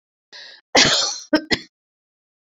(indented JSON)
{
  "cough_length": "2.6 s",
  "cough_amplitude": 32767,
  "cough_signal_mean_std_ratio": 0.36,
  "survey_phase": "beta (2021-08-13 to 2022-03-07)",
  "age": "65+",
  "gender": "Female",
  "wearing_mask": "No",
  "symptom_none": true,
  "smoker_status": "Ex-smoker",
  "respiratory_condition_asthma": false,
  "respiratory_condition_other": false,
  "recruitment_source": "REACT",
  "submission_delay": "1 day",
  "covid_test_result": "Negative",
  "covid_test_method": "RT-qPCR"
}